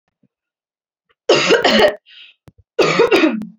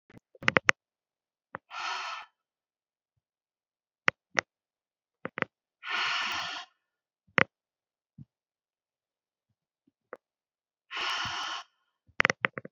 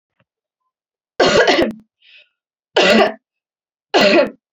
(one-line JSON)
{"cough_length": "3.6 s", "cough_amplitude": 30095, "cough_signal_mean_std_ratio": 0.5, "exhalation_length": "12.7 s", "exhalation_amplitude": 32768, "exhalation_signal_mean_std_ratio": 0.22, "three_cough_length": "4.5 s", "three_cough_amplitude": 31091, "three_cough_signal_mean_std_ratio": 0.44, "survey_phase": "alpha (2021-03-01 to 2021-08-12)", "age": "18-44", "gender": "Female", "wearing_mask": "No", "symptom_cough_any": true, "symptom_headache": true, "symptom_onset": "3 days", "smoker_status": "Never smoked", "respiratory_condition_asthma": false, "respiratory_condition_other": false, "recruitment_source": "Test and Trace", "submission_delay": "2 days", "covid_test_result": "Positive", "covid_test_method": "RT-qPCR"}